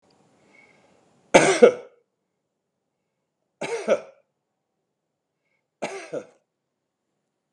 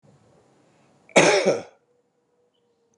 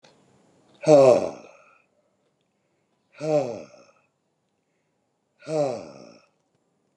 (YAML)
three_cough_length: 7.5 s
three_cough_amplitude: 32768
three_cough_signal_mean_std_ratio: 0.21
cough_length: 3.0 s
cough_amplitude: 25424
cough_signal_mean_std_ratio: 0.3
exhalation_length: 7.0 s
exhalation_amplitude: 24483
exhalation_signal_mean_std_ratio: 0.28
survey_phase: beta (2021-08-13 to 2022-03-07)
age: 65+
gender: Male
wearing_mask: 'No'
symptom_none: true
smoker_status: Never smoked
respiratory_condition_asthma: false
respiratory_condition_other: false
recruitment_source: REACT
submission_delay: 6 days
covid_test_result: Negative
covid_test_method: RT-qPCR
influenza_a_test_result: Negative
influenza_b_test_result: Negative